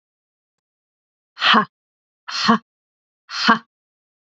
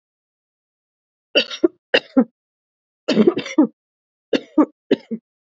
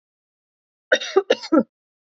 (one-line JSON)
{"exhalation_length": "4.3 s", "exhalation_amplitude": 28048, "exhalation_signal_mean_std_ratio": 0.3, "three_cough_length": "5.5 s", "three_cough_amplitude": 28158, "three_cough_signal_mean_std_ratio": 0.31, "cough_length": "2.0 s", "cough_amplitude": 23984, "cough_signal_mean_std_ratio": 0.31, "survey_phase": "alpha (2021-03-01 to 2021-08-12)", "age": "18-44", "gender": "Female", "wearing_mask": "No", "symptom_change_to_sense_of_smell_or_taste": true, "symptom_loss_of_taste": true, "smoker_status": "Never smoked", "respiratory_condition_asthma": false, "respiratory_condition_other": false, "recruitment_source": "Test and Trace", "submission_delay": "2 days", "covid_test_result": "Positive", "covid_test_method": "RT-qPCR", "covid_ct_value": 21.7, "covid_ct_gene": "ORF1ab gene", "covid_ct_mean": 22.3, "covid_viral_load": "48000 copies/ml", "covid_viral_load_category": "Low viral load (10K-1M copies/ml)"}